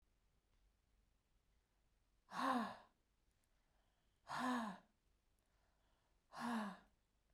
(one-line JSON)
{"exhalation_length": "7.3 s", "exhalation_amplitude": 1255, "exhalation_signal_mean_std_ratio": 0.35, "survey_phase": "beta (2021-08-13 to 2022-03-07)", "age": "45-64", "gender": "Female", "wearing_mask": "No", "symptom_sore_throat": true, "symptom_onset": "12 days", "smoker_status": "Ex-smoker", "respiratory_condition_asthma": false, "respiratory_condition_other": false, "recruitment_source": "REACT", "submission_delay": "1 day", "covid_test_result": "Negative", "covid_test_method": "RT-qPCR", "influenza_a_test_result": "Negative", "influenza_b_test_result": "Negative"}